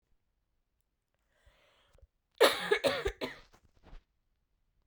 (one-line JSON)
{"cough_length": "4.9 s", "cough_amplitude": 10563, "cough_signal_mean_std_ratio": 0.27, "survey_phase": "beta (2021-08-13 to 2022-03-07)", "age": "18-44", "gender": "Female", "wearing_mask": "No", "symptom_runny_or_blocked_nose": true, "symptom_shortness_of_breath": true, "symptom_sore_throat": true, "symptom_fatigue": true, "symptom_headache": true, "symptom_change_to_sense_of_smell_or_taste": true, "symptom_loss_of_taste": true, "symptom_onset": "4 days", "smoker_status": "Never smoked", "respiratory_condition_asthma": true, "respiratory_condition_other": false, "recruitment_source": "Test and Trace", "submission_delay": "3 days", "covid_test_method": "RT-qPCR"}